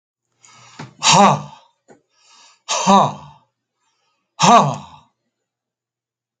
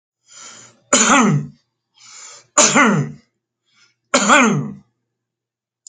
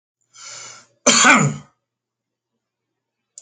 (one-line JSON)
{"exhalation_length": "6.4 s", "exhalation_amplitude": 31563, "exhalation_signal_mean_std_ratio": 0.34, "three_cough_length": "5.9 s", "three_cough_amplitude": 32463, "three_cough_signal_mean_std_ratio": 0.44, "cough_length": "3.4 s", "cough_amplitude": 30359, "cough_signal_mean_std_ratio": 0.31, "survey_phase": "alpha (2021-03-01 to 2021-08-12)", "age": "65+", "gender": "Male", "wearing_mask": "No", "symptom_none": true, "smoker_status": "Never smoked", "respiratory_condition_asthma": false, "respiratory_condition_other": false, "recruitment_source": "REACT", "submission_delay": "1 day", "covid_test_result": "Negative", "covid_test_method": "RT-qPCR"}